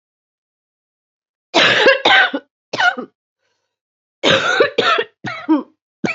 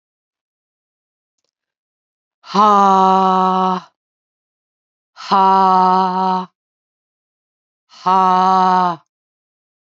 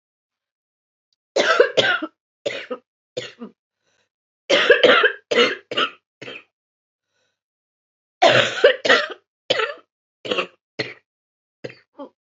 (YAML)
cough_length: 6.1 s
cough_amplitude: 29651
cough_signal_mean_std_ratio: 0.47
exhalation_length: 10.0 s
exhalation_amplitude: 30416
exhalation_signal_mean_std_ratio: 0.44
three_cough_length: 12.4 s
three_cough_amplitude: 28283
three_cough_signal_mean_std_ratio: 0.37
survey_phase: beta (2021-08-13 to 2022-03-07)
age: 45-64
gender: Female
wearing_mask: 'No'
symptom_cough_any: true
symptom_runny_or_blocked_nose: true
symptom_shortness_of_breath: true
symptom_sore_throat: true
symptom_abdominal_pain: true
symptom_diarrhoea: true
symptom_fatigue: true
symptom_headache: true
symptom_change_to_sense_of_smell_or_taste: true
symptom_onset: 5 days
smoker_status: Ex-smoker
respiratory_condition_asthma: true
respiratory_condition_other: false
recruitment_source: Test and Trace
submission_delay: 1 day
covid_test_result: Positive
covid_test_method: RT-qPCR
covid_ct_value: 19.1
covid_ct_gene: ORF1ab gene
covid_ct_mean: 19.4
covid_viral_load: 420000 copies/ml
covid_viral_load_category: Low viral load (10K-1M copies/ml)